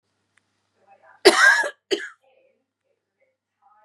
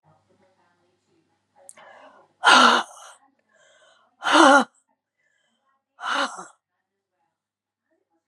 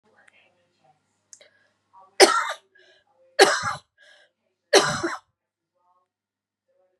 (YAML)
cough_length: 3.8 s
cough_amplitude: 32768
cough_signal_mean_std_ratio: 0.27
exhalation_length: 8.3 s
exhalation_amplitude: 28441
exhalation_signal_mean_std_ratio: 0.27
three_cough_length: 7.0 s
three_cough_amplitude: 32767
three_cough_signal_mean_std_ratio: 0.25
survey_phase: beta (2021-08-13 to 2022-03-07)
age: 45-64
gender: Female
wearing_mask: 'No'
symptom_cough_any: true
symptom_runny_or_blocked_nose: true
symptom_fatigue: true
symptom_change_to_sense_of_smell_or_taste: true
symptom_onset: 3 days
smoker_status: Never smoked
respiratory_condition_asthma: false
respiratory_condition_other: false
recruitment_source: Test and Trace
submission_delay: 2 days
covid_test_result: Positive
covid_test_method: RT-qPCR
covid_ct_value: 26.0
covid_ct_gene: ORF1ab gene
covid_ct_mean: 26.4
covid_viral_load: 2300 copies/ml
covid_viral_load_category: Minimal viral load (< 10K copies/ml)